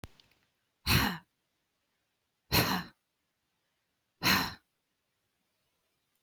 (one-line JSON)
{"exhalation_length": "6.2 s", "exhalation_amplitude": 9661, "exhalation_signal_mean_std_ratio": 0.29, "survey_phase": "beta (2021-08-13 to 2022-03-07)", "age": "45-64", "gender": "Female", "wearing_mask": "No", "symptom_none": true, "smoker_status": "Ex-smoker", "respiratory_condition_asthma": true, "respiratory_condition_other": false, "recruitment_source": "REACT", "submission_delay": "2 days", "covid_test_result": "Negative", "covid_test_method": "RT-qPCR", "influenza_a_test_result": "Negative", "influenza_b_test_result": "Negative"}